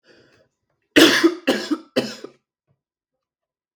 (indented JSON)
{
  "three_cough_length": "3.8 s",
  "three_cough_amplitude": 32768,
  "three_cough_signal_mean_std_ratio": 0.32,
  "survey_phase": "beta (2021-08-13 to 2022-03-07)",
  "age": "18-44",
  "gender": "Male",
  "wearing_mask": "No",
  "symptom_none": true,
  "smoker_status": "Never smoked",
  "respiratory_condition_asthma": false,
  "respiratory_condition_other": false,
  "recruitment_source": "REACT",
  "submission_delay": "1 day",
  "covid_test_result": "Negative",
  "covid_test_method": "RT-qPCR",
  "influenza_a_test_result": "Negative",
  "influenza_b_test_result": "Negative"
}